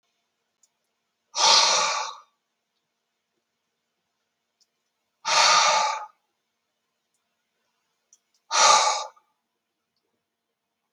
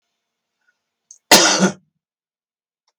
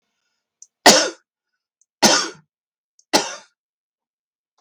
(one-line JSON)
{"exhalation_length": "10.9 s", "exhalation_amplitude": 19705, "exhalation_signal_mean_std_ratio": 0.33, "cough_length": "3.0 s", "cough_amplitude": 32768, "cough_signal_mean_std_ratio": 0.28, "three_cough_length": "4.6 s", "three_cough_amplitude": 32768, "three_cough_signal_mean_std_ratio": 0.27, "survey_phase": "beta (2021-08-13 to 2022-03-07)", "age": "45-64", "gender": "Male", "wearing_mask": "No", "symptom_none": true, "smoker_status": "Never smoked", "respiratory_condition_asthma": false, "respiratory_condition_other": false, "recruitment_source": "Test and Trace", "submission_delay": "1 day", "covid_test_result": "Negative", "covid_test_method": "RT-qPCR"}